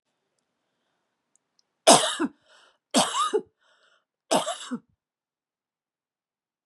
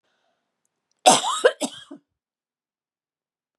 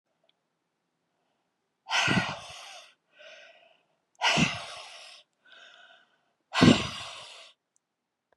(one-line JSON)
{"three_cough_length": "6.7 s", "three_cough_amplitude": 27183, "three_cough_signal_mean_std_ratio": 0.27, "cough_length": "3.6 s", "cough_amplitude": 30194, "cough_signal_mean_std_ratio": 0.25, "exhalation_length": "8.4 s", "exhalation_amplitude": 21751, "exhalation_signal_mean_std_ratio": 0.3, "survey_phase": "beta (2021-08-13 to 2022-03-07)", "age": "65+", "gender": "Female", "wearing_mask": "No", "symptom_fatigue": true, "symptom_onset": "7 days", "smoker_status": "Never smoked", "respiratory_condition_asthma": false, "respiratory_condition_other": false, "recruitment_source": "Test and Trace", "submission_delay": "2 days", "covid_test_result": "Positive", "covid_test_method": "RT-qPCR", "covid_ct_value": 17.4, "covid_ct_gene": "ORF1ab gene"}